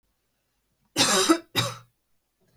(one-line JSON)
{"cough_length": "2.6 s", "cough_amplitude": 15635, "cough_signal_mean_std_ratio": 0.37, "survey_phase": "beta (2021-08-13 to 2022-03-07)", "age": "18-44", "gender": "Female", "wearing_mask": "No", "symptom_none": true, "smoker_status": "Never smoked", "respiratory_condition_asthma": false, "respiratory_condition_other": false, "recruitment_source": "REACT", "submission_delay": "1 day", "covid_test_result": "Negative", "covid_test_method": "RT-qPCR"}